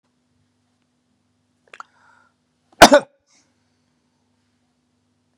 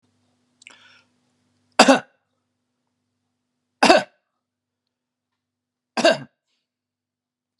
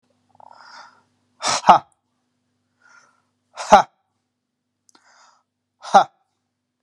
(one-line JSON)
{"cough_length": "5.4 s", "cough_amplitude": 32768, "cough_signal_mean_std_ratio": 0.14, "three_cough_length": "7.6 s", "three_cough_amplitude": 32768, "three_cough_signal_mean_std_ratio": 0.2, "exhalation_length": "6.8 s", "exhalation_amplitude": 32768, "exhalation_signal_mean_std_ratio": 0.2, "survey_phase": "beta (2021-08-13 to 2022-03-07)", "age": "45-64", "gender": "Male", "wearing_mask": "No", "symptom_none": true, "smoker_status": "Never smoked", "respiratory_condition_asthma": false, "respiratory_condition_other": false, "recruitment_source": "REACT", "submission_delay": "1 day", "covid_test_result": "Negative", "covid_test_method": "RT-qPCR"}